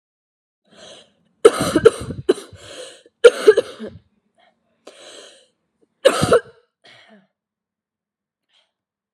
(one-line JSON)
{"cough_length": "9.1 s", "cough_amplitude": 32768, "cough_signal_mean_std_ratio": 0.24, "survey_phase": "alpha (2021-03-01 to 2021-08-12)", "age": "18-44", "gender": "Female", "wearing_mask": "No", "symptom_cough_any": true, "symptom_fatigue": true, "symptom_fever_high_temperature": true, "symptom_onset": "3 days", "smoker_status": "Current smoker (1 to 10 cigarettes per day)", "respiratory_condition_asthma": false, "respiratory_condition_other": false, "recruitment_source": "Test and Trace", "submission_delay": "2 days", "covid_test_result": "Positive", "covid_test_method": "RT-qPCR", "covid_ct_value": 17.4, "covid_ct_gene": "ORF1ab gene", "covid_ct_mean": 18.4, "covid_viral_load": "920000 copies/ml", "covid_viral_load_category": "Low viral load (10K-1M copies/ml)"}